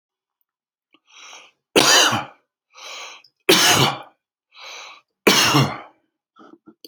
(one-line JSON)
{"three_cough_length": "6.9 s", "three_cough_amplitude": 31038, "three_cough_signal_mean_std_ratio": 0.38, "survey_phase": "alpha (2021-03-01 to 2021-08-12)", "age": "45-64", "gender": "Male", "wearing_mask": "No", "symptom_none": true, "smoker_status": "Current smoker (1 to 10 cigarettes per day)", "respiratory_condition_asthma": true, "respiratory_condition_other": false, "recruitment_source": "REACT", "submission_delay": "2 days", "covid_test_result": "Negative", "covid_test_method": "RT-qPCR"}